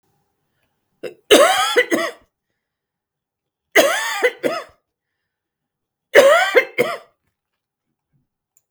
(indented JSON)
{
  "three_cough_length": "8.7 s",
  "three_cough_amplitude": 32768,
  "three_cough_signal_mean_std_ratio": 0.36,
  "survey_phase": "beta (2021-08-13 to 2022-03-07)",
  "age": "65+",
  "gender": "Female",
  "wearing_mask": "No",
  "symptom_none": true,
  "smoker_status": "Ex-smoker",
  "respiratory_condition_asthma": false,
  "respiratory_condition_other": false,
  "recruitment_source": "REACT",
  "submission_delay": "2 days",
  "covid_test_result": "Negative",
  "covid_test_method": "RT-qPCR",
  "influenza_a_test_result": "Unknown/Void",
  "influenza_b_test_result": "Unknown/Void"
}